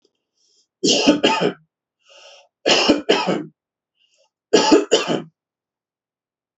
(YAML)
three_cough_length: 6.6 s
three_cough_amplitude: 28552
three_cough_signal_mean_std_ratio: 0.42
survey_phase: beta (2021-08-13 to 2022-03-07)
age: 45-64
gender: Male
wearing_mask: 'No'
symptom_none: true
smoker_status: Never smoked
respiratory_condition_asthma: false
respiratory_condition_other: false
recruitment_source: REACT
submission_delay: 5 days
covid_test_result: Negative
covid_test_method: RT-qPCR
influenza_a_test_result: Negative
influenza_b_test_result: Negative